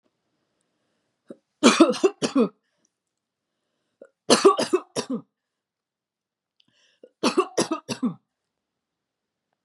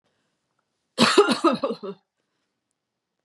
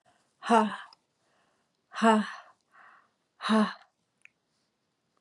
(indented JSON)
{
  "three_cough_length": "9.6 s",
  "three_cough_amplitude": 30394,
  "three_cough_signal_mean_std_ratio": 0.29,
  "cough_length": "3.2 s",
  "cough_amplitude": 27737,
  "cough_signal_mean_std_ratio": 0.34,
  "exhalation_length": "5.2 s",
  "exhalation_amplitude": 12595,
  "exhalation_signal_mean_std_ratio": 0.32,
  "survey_phase": "beta (2021-08-13 to 2022-03-07)",
  "age": "45-64",
  "gender": "Female",
  "wearing_mask": "No",
  "symptom_sore_throat": true,
  "symptom_diarrhoea": true,
  "symptom_fever_high_temperature": true,
  "symptom_onset": "3 days",
  "smoker_status": "Never smoked",
  "respiratory_condition_asthma": false,
  "respiratory_condition_other": false,
  "recruitment_source": "Test and Trace",
  "submission_delay": "2 days",
  "covid_test_result": "Positive",
  "covid_test_method": "RT-qPCR",
  "covid_ct_value": 35.3,
  "covid_ct_gene": "ORF1ab gene"
}